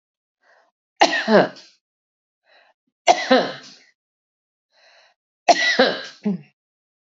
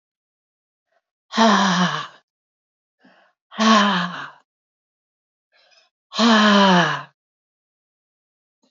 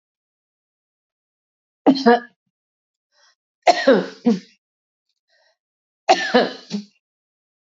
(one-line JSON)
{"cough_length": "7.2 s", "cough_amplitude": 32767, "cough_signal_mean_std_ratio": 0.32, "exhalation_length": "8.7 s", "exhalation_amplitude": 26290, "exhalation_signal_mean_std_ratio": 0.4, "three_cough_length": "7.7 s", "three_cough_amplitude": 27750, "three_cough_signal_mean_std_ratio": 0.29, "survey_phase": "alpha (2021-03-01 to 2021-08-12)", "age": "45-64", "gender": "Female", "wearing_mask": "No", "symptom_cough_any": true, "smoker_status": "Ex-smoker", "respiratory_condition_asthma": false, "respiratory_condition_other": false, "recruitment_source": "REACT", "submission_delay": "1 day", "covid_test_result": "Negative", "covid_test_method": "RT-qPCR"}